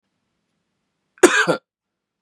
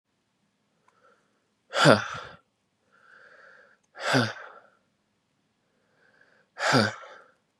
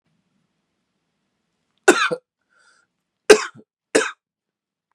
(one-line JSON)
{"cough_length": "2.2 s", "cough_amplitude": 32768, "cough_signal_mean_std_ratio": 0.26, "exhalation_length": "7.6 s", "exhalation_amplitude": 27196, "exhalation_signal_mean_std_ratio": 0.27, "three_cough_length": "4.9 s", "three_cough_amplitude": 32768, "three_cough_signal_mean_std_ratio": 0.21, "survey_phase": "beta (2021-08-13 to 2022-03-07)", "age": "18-44", "gender": "Male", "wearing_mask": "No", "symptom_cough_any": true, "symptom_new_continuous_cough": true, "symptom_runny_or_blocked_nose": true, "symptom_fatigue": true, "symptom_change_to_sense_of_smell_or_taste": true, "symptom_loss_of_taste": true, "smoker_status": "Never smoked", "respiratory_condition_asthma": false, "respiratory_condition_other": false, "recruitment_source": "Test and Trace", "submission_delay": "1 day", "covid_test_result": "Positive", "covid_test_method": "RT-qPCR", "covid_ct_value": 23.3, "covid_ct_gene": "N gene"}